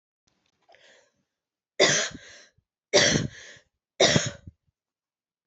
{"three_cough_length": "5.5 s", "three_cough_amplitude": 19943, "three_cough_signal_mean_std_ratio": 0.32, "survey_phase": "beta (2021-08-13 to 2022-03-07)", "age": "18-44", "gender": "Female", "wearing_mask": "No", "symptom_cough_any": true, "symptom_runny_or_blocked_nose": true, "symptom_shortness_of_breath": true, "symptom_headache": true, "symptom_change_to_sense_of_smell_or_taste": true, "symptom_loss_of_taste": true, "symptom_other": true, "smoker_status": "Never smoked", "respiratory_condition_asthma": false, "respiratory_condition_other": false, "recruitment_source": "Test and Trace", "submission_delay": "1 day", "covid_test_result": "Positive", "covid_test_method": "ePCR"}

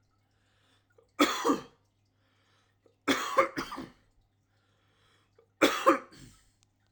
{"three_cough_length": "6.9 s", "three_cough_amplitude": 13869, "three_cough_signal_mean_std_ratio": 0.31, "survey_phase": "alpha (2021-03-01 to 2021-08-12)", "age": "18-44", "gender": "Male", "wearing_mask": "No", "symptom_none": true, "smoker_status": "Never smoked", "respiratory_condition_asthma": false, "respiratory_condition_other": false, "recruitment_source": "REACT", "submission_delay": "1 day", "covid_test_result": "Negative", "covid_test_method": "RT-qPCR"}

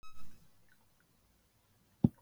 {"cough_length": "2.2 s", "cough_amplitude": 8417, "cough_signal_mean_std_ratio": 0.26, "survey_phase": "beta (2021-08-13 to 2022-03-07)", "age": "65+", "gender": "Female", "wearing_mask": "No", "symptom_none": true, "smoker_status": "Never smoked", "respiratory_condition_asthma": false, "respiratory_condition_other": false, "recruitment_source": "REACT", "submission_delay": "1 day", "covid_test_result": "Negative", "covid_test_method": "RT-qPCR", "influenza_a_test_result": "Negative", "influenza_b_test_result": "Negative"}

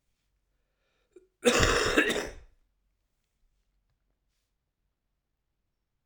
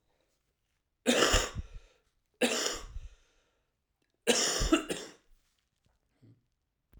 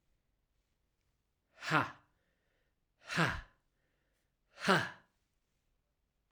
{"cough_length": "6.1 s", "cough_amplitude": 15274, "cough_signal_mean_std_ratio": 0.29, "three_cough_length": "7.0 s", "three_cough_amplitude": 10253, "three_cough_signal_mean_std_ratio": 0.37, "exhalation_length": "6.3 s", "exhalation_amplitude": 7141, "exhalation_signal_mean_std_ratio": 0.26, "survey_phase": "alpha (2021-03-01 to 2021-08-12)", "age": "18-44", "gender": "Male", "wearing_mask": "No", "symptom_cough_any": true, "symptom_abdominal_pain": true, "symptom_headache": true, "symptom_change_to_sense_of_smell_or_taste": true, "symptom_onset": "2 days", "smoker_status": "Ex-smoker", "respiratory_condition_asthma": false, "respiratory_condition_other": false, "recruitment_source": "Test and Trace", "submission_delay": "2 days", "covid_test_result": "Positive", "covid_test_method": "RT-qPCR", "covid_ct_value": 31.4, "covid_ct_gene": "N gene"}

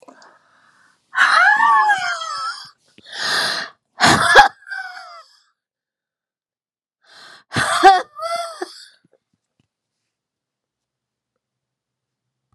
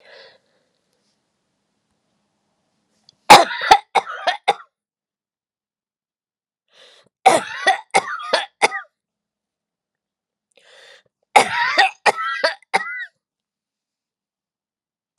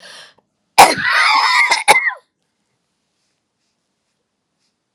{"exhalation_length": "12.5 s", "exhalation_amplitude": 32768, "exhalation_signal_mean_std_ratio": 0.37, "three_cough_length": "15.2 s", "three_cough_amplitude": 32768, "three_cough_signal_mean_std_ratio": 0.26, "cough_length": "4.9 s", "cough_amplitude": 32768, "cough_signal_mean_std_ratio": 0.38, "survey_phase": "beta (2021-08-13 to 2022-03-07)", "age": "65+", "gender": "Female", "wearing_mask": "No", "symptom_none": true, "smoker_status": "Never smoked", "respiratory_condition_asthma": false, "respiratory_condition_other": false, "recruitment_source": "REACT", "submission_delay": "11 days", "covid_test_result": "Negative", "covid_test_method": "RT-qPCR"}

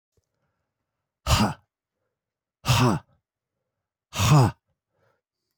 {"exhalation_length": "5.6 s", "exhalation_amplitude": 13718, "exhalation_signal_mean_std_ratio": 0.33, "survey_phase": "alpha (2021-03-01 to 2021-08-12)", "age": "65+", "gender": "Male", "wearing_mask": "No", "symptom_cough_any": true, "symptom_fatigue": true, "symptom_change_to_sense_of_smell_or_taste": true, "symptom_onset": "2 days", "smoker_status": "Ex-smoker", "respiratory_condition_asthma": false, "respiratory_condition_other": false, "recruitment_source": "Test and Trace", "submission_delay": "2 days", "covid_test_result": "Positive", "covid_test_method": "RT-qPCR"}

